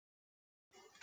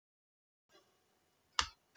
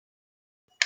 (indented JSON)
{
  "exhalation_length": "1.0 s",
  "exhalation_amplitude": 21650,
  "exhalation_signal_mean_std_ratio": 0.05,
  "three_cough_length": "2.0 s",
  "three_cough_amplitude": 8568,
  "three_cough_signal_mean_std_ratio": 0.13,
  "cough_length": "0.9 s",
  "cough_amplitude": 20186,
  "cough_signal_mean_std_ratio": 0.11,
  "survey_phase": "beta (2021-08-13 to 2022-03-07)",
  "age": "65+",
  "gender": "Female",
  "wearing_mask": "No",
  "symptom_none": true,
  "smoker_status": "Never smoked",
  "respiratory_condition_asthma": false,
  "respiratory_condition_other": false,
  "recruitment_source": "REACT",
  "submission_delay": "1 day",
  "covid_test_result": "Negative",
  "covid_test_method": "RT-qPCR"
}